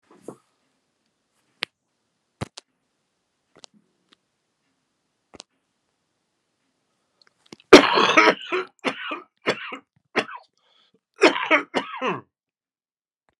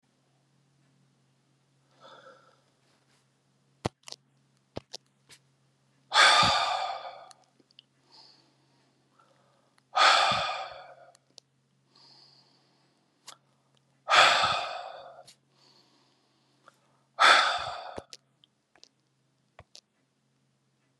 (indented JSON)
{
  "three_cough_length": "13.4 s",
  "three_cough_amplitude": 32768,
  "three_cough_signal_mean_std_ratio": 0.23,
  "exhalation_length": "21.0 s",
  "exhalation_amplitude": 16729,
  "exhalation_signal_mean_std_ratio": 0.28,
  "survey_phase": "beta (2021-08-13 to 2022-03-07)",
  "age": "65+",
  "gender": "Male",
  "wearing_mask": "No",
  "symptom_cough_any": true,
  "symptom_runny_or_blocked_nose": true,
  "smoker_status": "Never smoked",
  "respiratory_condition_asthma": false,
  "respiratory_condition_other": false,
  "recruitment_source": "Test and Trace",
  "submission_delay": "1 day",
  "covid_test_result": "Positive",
  "covid_test_method": "RT-qPCR",
  "covid_ct_value": 9.4,
  "covid_ct_gene": "ORF1ab gene",
  "covid_ct_mean": 9.6,
  "covid_viral_load": "700000000 copies/ml",
  "covid_viral_load_category": "High viral load (>1M copies/ml)"
}